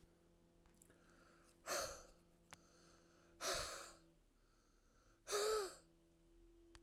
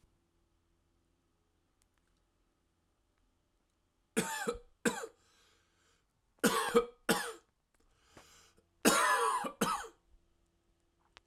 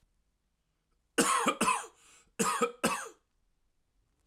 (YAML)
exhalation_length: 6.8 s
exhalation_amplitude: 1127
exhalation_signal_mean_std_ratio: 0.4
three_cough_length: 11.3 s
three_cough_amplitude: 9316
three_cough_signal_mean_std_ratio: 0.32
cough_length: 4.3 s
cough_amplitude: 9051
cough_signal_mean_std_ratio: 0.41
survey_phase: alpha (2021-03-01 to 2021-08-12)
age: 18-44
gender: Male
wearing_mask: 'No'
symptom_none: true
smoker_status: Never smoked
respiratory_condition_asthma: false
respiratory_condition_other: false
recruitment_source: REACT
submission_delay: 1 day
covid_test_result: Negative
covid_test_method: RT-qPCR